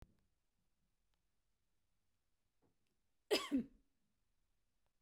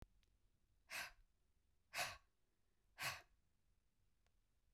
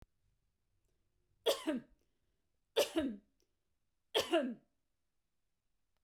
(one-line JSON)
{"cough_length": "5.0 s", "cough_amplitude": 2336, "cough_signal_mean_std_ratio": 0.2, "exhalation_length": "4.7 s", "exhalation_amplitude": 853, "exhalation_signal_mean_std_ratio": 0.33, "three_cough_length": "6.0 s", "three_cough_amplitude": 3367, "three_cough_signal_mean_std_ratio": 0.31, "survey_phase": "beta (2021-08-13 to 2022-03-07)", "age": "45-64", "gender": "Female", "wearing_mask": "No", "symptom_fatigue": true, "symptom_onset": "12 days", "smoker_status": "Never smoked", "respiratory_condition_asthma": false, "respiratory_condition_other": false, "recruitment_source": "REACT", "submission_delay": "11 days", "covid_test_result": "Negative", "covid_test_method": "RT-qPCR"}